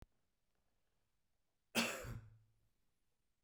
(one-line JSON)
{"three_cough_length": "3.4 s", "three_cough_amplitude": 2560, "three_cough_signal_mean_std_ratio": 0.27, "survey_phase": "beta (2021-08-13 to 2022-03-07)", "age": "45-64", "gender": "Male", "wearing_mask": "No", "symptom_cough_any": true, "smoker_status": "Never smoked", "respiratory_condition_asthma": false, "respiratory_condition_other": false, "recruitment_source": "REACT", "submission_delay": "0 days", "covid_test_result": "Negative", "covid_test_method": "RT-qPCR"}